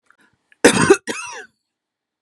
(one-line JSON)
{"cough_length": "2.2 s", "cough_amplitude": 32768, "cough_signal_mean_std_ratio": 0.31, "survey_phase": "beta (2021-08-13 to 2022-03-07)", "age": "45-64", "gender": "Female", "wearing_mask": "No", "symptom_none": true, "smoker_status": "Ex-smoker", "respiratory_condition_asthma": false, "respiratory_condition_other": false, "recruitment_source": "REACT", "submission_delay": "2 days", "covid_test_result": "Negative", "covid_test_method": "RT-qPCR", "influenza_a_test_result": "Negative", "influenza_b_test_result": "Negative"}